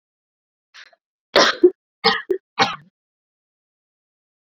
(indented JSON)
{
  "three_cough_length": "4.5 s",
  "three_cough_amplitude": 29039,
  "three_cough_signal_mean_std_ratio": 0.27,
  "survey_phase": "beta (2021-08-13 to 2022-03-07)",
  "age": "18-44",
  "gender": "Female",
  "wearing_mask": "Yes",
  "symptom_cough_any": true,
  "symptom_new_continuous_cough": true,
  "symptom_runny_or_blocked_nose": true,
  "symptom_shortness_of_breath": true,
  "symptom_sore_throat": true,
  "symptom_abdominal_pain": true,
  "symptom_diarrhoea": true,
  "symptom_fatigue": true,
  "symptom_headache": true,
  "symptom_change_to_sense_of_smell_or_taste": true,
  "symptom_loss_of_taste": true,
  "symptom_onset": "3 days",
  "smoker_status": "Ex-smoker",
  "respiratory_condition_asthma": false,
  "respiratory_condition_other": false,
  "recruitment_source": "Test and Trace",
  "submission_delay": "1 day",
  "covid_test_result": "Positive",
  "covid_test_method": "RT-qPCR",
  "covid_ct_value": 18.6,
  "covid_ct_gene": "ORF1ab gene",
  "covid_ct_mean": 19.4,
  "covid_viral_load": "440000 copies/ml",
  "covid_viral_load_category": "Low viral load (10K-1M copies/ml)"
}